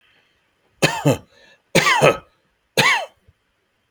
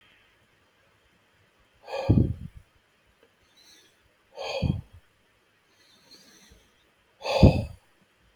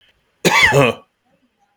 three_cough_length: 3.9 s
three_cough_amplitude: 32767
three_cough_signal_mean_std_ratio: 0.39
exhalation_length: 8.4 s
exhalation_amplitude: 26555
exhalation_signal_mean_std_ratio: 0.25
cough_length: 1.8 s
cough_amplitude: 32767
cough_signal_mean_std_ratio: 0.44
survey_phase: beta (2021-08-13 to 2022-03-07)
age: 45-64
gender: Male
wearing_mask: 'No'
symptom_none: true
symptom_onset: 12 days
smoker_status: Never smoked
respiratory_condition_asthma: false
respiratory_condition_other: false
recruitment_source: REACT
submission_delay: 2 days
covid_test_result: Negative
covid_test_method: RT-qPCR
covid_ct_value: 37.9
covid_ct_gene: N gene
influenza_a_test_result: Negative
influenza_b_test_result: Negative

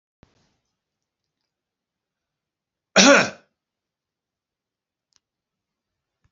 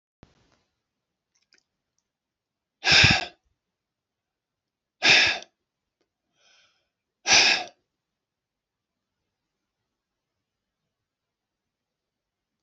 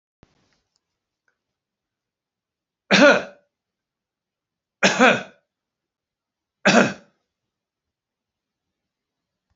cough_length: 6.3 s
cough_amplitude: 32197
cough_signal_mean_std_ratio: 0.17
exhalation_length: 12.6 s
exhalation_amplitude: 23313
exhalation_signal_mean_std_ratio: 0.22
three_cough_length: 9.6 s
three_cough_amplitude: 29205
three_cough_signal_mean_std_ratio: 0.23
survey_phase: beta (2021-08-13 to 2022-03-07)
age: 65+
gender: Male
wearing_mask: 'No'
symptom_none: true
smoker_status: Ex-smoker
respiratory_condition_asthma: false
respiratory_condition_other: false
recruitment_source: REACT
submission_delay: 1 day
covid_test_result: Negative
covid_test_method: RT-qPCR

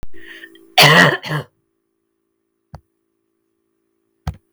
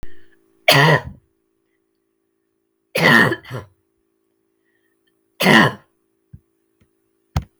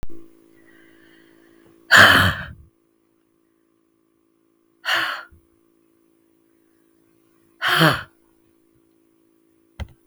cough_length: 4.5 s
cough_amplitude: 32768
cough_signal_mean_std_ratio: 0.31
three_cough_length: 7.6 s
three_cough_amplitude: 32768
three_cough_signal_mean_std_ratio: 0.32
exhalation_length: 10.1 s
exhalation_amplitude: 32768
exhalation_signal_mean_std_ratio: 0.27
survey_phase: beta (2021-08-13 to 2022-03-07)
age: 45-64
gender: Female
wearing_mask: 'No'
symptom_runny_or_blocked_nose: true
smoker_status: Never smoked
respiratory_condition_asthma: false
respiratory_condition_other: false
recruitment_source: Test and Trace
submission_delay: 2 days
covid_test_result: Positive
covid_test_method: RT-qPCR
covid_ct_value: 19.0
covid_ct_gene: ORF1ab gene
covid_ct_mean: 19.9
covid_viral_load: 300000 copies/ml
covid_viral_load_category: Low viral load (10K-1M copies/ml)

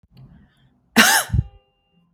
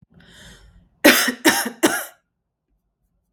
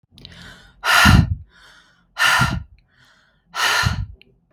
cough_length: 2.1 s
cough_amplitude: 32766
cough_signal_mean_std_ratio: 0.34
three_cough_length: 3.3 s
three_cough_amplitude: 32768
three_cough_signal_mean_std_ratio: 0.34
exhalation_length: 4.5 s
exhalation_amplitude: 32768
exhalation_signal_mean_std_ratio: 0.45
survey_phase: beta (2021-08-13 to 2022-03-07)
age: 18-44
gender: Female
wearing_mask: 'No'
symptom_none: true
smoker_status: Ex-smoker
respiratory_condition_asthma: false
respiratory_condition_other: false
recruitment_source: REACT
submission_delay: 1 day
covid_test_result: Negative
covid_test_method: RT-qPCR
influenza_a_test_result: Negative
influenza_b_test_result: Negative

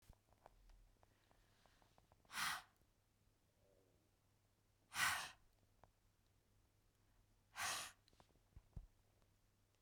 exhalation_length: 9.8 s
exhalation_amplitude: 1748
exhalation_signal_mean_std_ratio: 0.3
survey_phase: beta (2021-08-13 to 2022-03-07)
age: 45-64
gender: Female
wearing_mask: 'No'
symptom_runny_or_blocked_nose: true
smoker_status: Ex-smoker
respiratory_condition_asthma: false
respiratory_condition_other: false
recruitment_source: REACT
submission_delay: 2 days
covid_test_result: Negative
covid_test_method: RT-qPCR
influenza_a_test_result: Negative
influenza_b_test_result: Negative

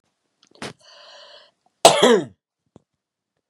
cough_length: 3.5 s
cough_amplitude: 32768
cough_signal_mean_std_ratio: 0.25
survey_phase: beta (2021-08-13 to 2022-03-07)
age: 45-64
gender: Female
wearing_mask: 'No'
symptom_cough_any: true
smoker_status: Current smoker (11 or more cigarettes per day)
respiratory_condition_asthma: false
respiratory_condition_other: false
recruitment_source: REACT
submission_delay: 1 day
covid_test_result: Negative
covid_test_method: RT-qPCR
influenza_a_test_result: Negative
influenza_b_test_result: Negative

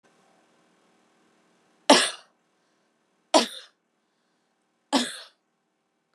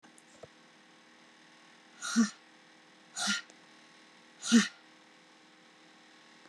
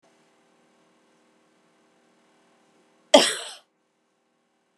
three_cough_length: 6.1 s
three_cough_amplitude: 24977
three_cough_signal_mean_std_ratio: 0.21
exhalation_length: 6.5 s
exhalation_amplitude: 7440
exhalation_signal_mean_std_ratio: 0.28
cough_length: 4.8 s
cough_amplitude: 32472
cough_signal_mean_std_ratio: 0.16
survey_phase: beta (2021-08-13 to 2022-03-07)
age: 45-64
gender: Female
wearing_mask: 'No'
symptom_fatigue: true
symptom_headache: true
smoker_status: Current smoker (11 or more cigarettes per day)
respiratory_condition_asthma: false
respiratory_condition_other: false
recruitment_source: REACT
submission_delay: 1 day
covid_test_result: Negative
covid_test_method: RT-qPCR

